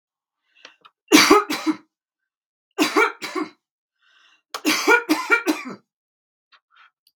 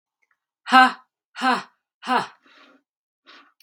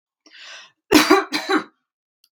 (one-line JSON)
{"three_cough_length": "7.2 s", "three_cough_amplitude": 32767, "three_cough_signal_mean_std_ratio": 0.36, "exhalation_length": "3.6 s", "exhalation_amplitude": 32767, "exhalation_signal_mean_std_ratio": 0.28, "cough_length": "2.3 s", "cough_amplitude": 32767, "cough_signal_mean_std_ratio": 0.37, "survey_phase": "beta (2021-08-13 to 2022-03-07)", "age": "45-64", "gender": "Female", "wearing_mask": "No", "symptom_none": true, "smoker_status": "Ex-smoker", "respiratory_condition_asthma": false, "respiratory_condition_other": false, "recruitment_source": "REACT", "submission_delay": "0 days", "covid_test_result": "Negative", "covid_test_method": "RT-qPCR", "influenza_a_test_result": "Negative", "influenza_b_test_result": "Negative"}